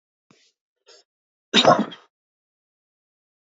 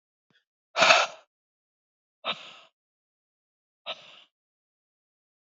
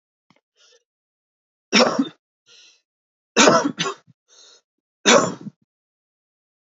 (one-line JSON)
{"cough_length": "3.5 s", "cough_amplitude": 26610, "cough_signal_mean_std_ratio": 0.22, "exhalation_length": "5.5 s", "exhalation_amplitude": 24681, "exhalation_signal_mean_std_ratio": 0.21, "three_cough_length": "6.7 s", "three_cough_amplitude": 32767, "three_cough_signal_mean_std_ratio": 0.3, "survey_phase": "alpha (2021-03-01 to 2021-08-12)", "age": "45-64", "gender": "Male", "wearing_mask": "No", "symptom_none": true, "smoker_status": "Ex-smoker", "respiratory_condition_asthma": false, "respiratory_condition_other": false, "recruitment_source": "Test and Trace", "submission_delay": "2 days", "covid_test_result": "Positive", "covid_test_method": "RT-qPCR", "covid_ct_value": 32.8, "covid_ct_gene": "N gene"}